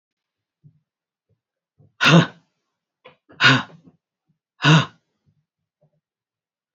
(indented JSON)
{
  "exhalation_length": "6.7 s",
  "exhalation_amplitude": 27266,
  "exhalation_signal_mean_std_ratio": 0.25,
  "survey_phase": "beta (2021-08-13 to 2022-03-07)",
  "age": "45-64",
  "gender": "Female",
  "wearing_mask": "No",
  "symptom_cough_any": true,
  "symptom_fatigue": true,
  "symptom_fever_high_temperature": true,
  "symptom_headache": true,
  "symptom_other": true,
  "smoker_status": "Never smoked",
  "respiratory_condition_asthma": false,
  "respiratory_condition_other": false,
  "recruitment_source": "Test and Trace",
  "submission_delay": "2 days",
  "covid_test_result": "Positive",
  "covid_test_method": "LFT"
}